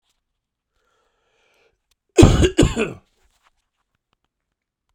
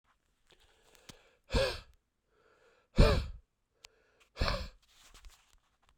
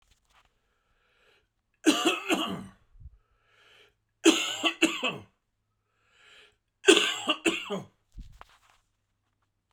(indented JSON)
{
  "cough_length": "4.9 s",
  "cough_amplitude": 32768,
  "cough_signal_mean_std_ratio": 0.25,
  "exhalation_length": "6.0 s",
  "exhalation_amplitude": 9424,
  "exhalation_signal_mean_std_ratio": 0.27,
  "three_cough_length": "9.7 s",
  "three_cough_amplitude": 22646,
  "three_cough_signal_mean_std_ratio": 0.32,
  "survey_phase": "beta (2021-08-13 to 2022-03-07)",
  "age": "45-64",
  "gender": "Male",
  "wearing_mask": "No",
  "symptom_cough_any": true,
  "symptom_new_continuous_cough": true,
  "symptom_sore_throat": true,
  "symptom_fatigue": true,
  "symptom_fever_high_temperature": true,
  "symptom_onset": "6 days",
  "smoker_status": "Ex-smoker",
  "respiratory_condition_asthma": false,
  "respiratory_condition_other": false,
  "recruitment_source": "Test and Trace",
  "submission_delay": "2 days",
  "covid_test_result": "Positive",
  "covid_test_method": "ePCR"
}